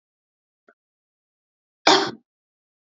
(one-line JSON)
{"cough_length": "2.8 s", "cough_amplitude": 30048, "cough_signal_mean_std_ratio": 0.21, "survey_phase": "beta (2021-08-13 to 2022-03-07)", "age": "18-44", "gender": "Female", "wearing_mask": "No", "symptom_none": true, "smoker_status": "Never smoked", "respiratory_condition_asthma": false, "respiratory_condition_other": false, "recruitment_source": "REACT", "submission_delay": "1 day", "covid_test_result": "Negative", "covid_test_method": "RT-qPCR"}